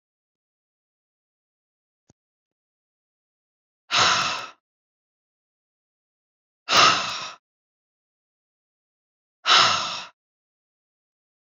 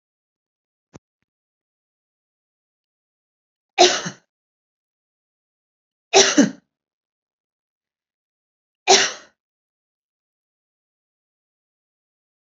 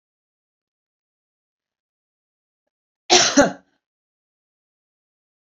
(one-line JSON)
{"exhalation_length": "11.4 s", "exhalation_amplitude": 24524, "exhalation_signal_mean_std_ratio": 0.27, "three_cough_length": "12.5 s", "three_cough_amplitude": 32767, "three_cough_signal_mean_std_ratio": 0.18, "cough_length": "5.5 s", "cough_amplitude": 31253, "cough_signal_mean_std_ratio": 0.2, "survey_phase": "beta (2021-08-13 to 2022-03-07)", "age": "65+", "gender": "Female", "wearing_mask": "No", "symptom_none": true, "smoker_status": "Ex-smoker", "respiratory_condition_asthma": false, "respiratory_condition_other": false, "recruitment_source": "REACT", "submission_delay": "2 days", "covid_test_result": "Negative", "covid_test_method": "RT-qPCR"}